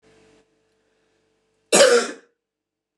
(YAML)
cough_length: 3.0 s
cough_amplitude: 28272
cough_signal_mean_std_ratio: 0.28
survey_phase: beta (2021-08-13 to 2022-03-07)
age: 45-64
gender: Female
wearing_mask: 'No'
symptom_cough_any: true
symptom_runny_or_blocked_nose: true
symptom_fatigue: true
symptom_onset: 5 days
smoker_status: Ex-smoker
respiratory_condition_asthma: false
respiratory_condition_other: false
recruitment_source: Test and Trace
submission_delay: 3 days
covid_test_result: Positive
covid_test_method: RT-qPCR
covid_ct_value: 14.6
covid_ct_gene: ORF1ab gene
covid_ct_mean: 14.8
covid_viral_load: 14000000 copies/ml
covid_viral_load_category: High viral load (>1M copies/ml)